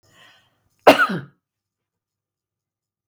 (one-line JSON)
{"cough_length": "3.1 s", "cough_amplitude": 32768, "cough_signal_mean_std_ratio": 0.2, "survey_phase": "beta (2021-08-13 to 2022-03-07)", "age": "65+", "gender": "Female", "wearing_mask": "No", "symptom_runny_or_blocked_nose": true, "smoker_status": "Never smoked", "respiratory_condition_asthma": false, "respiratory_condition_other": false, "recruitment_source": "REACT", "submission_delay": "1 day", "covid_test_result": "Negative", "covid_test_method": "RT-qPCR"}